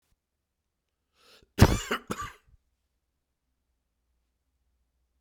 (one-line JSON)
{"cough_length": "5.2 s", "cough_amplitude": 22623, "cough_signal_mean_std_ratio": 0.17, "survey_phase": "beta (2021-08-13 to 2022-03-07)", "age": "45-64", "gender": "Male", "wearing_mask": "No", "symptom_cough_any": true, "symptom_runny_or_blocked_nose": true, "symptom_sore_throat": true, "symptom_fatigue": true, "symptom_headache": true, "symptom_onset": "4 days", "smoker_status": "Never smoked", "respiratory_condition_asthma": false, "respiratory_condition_other": false, "recruitment_source": "Test and Trace", "submission_delay": "2 days", "covid_test_result": "Positive", "covid_test_method": "RT-qPCR"}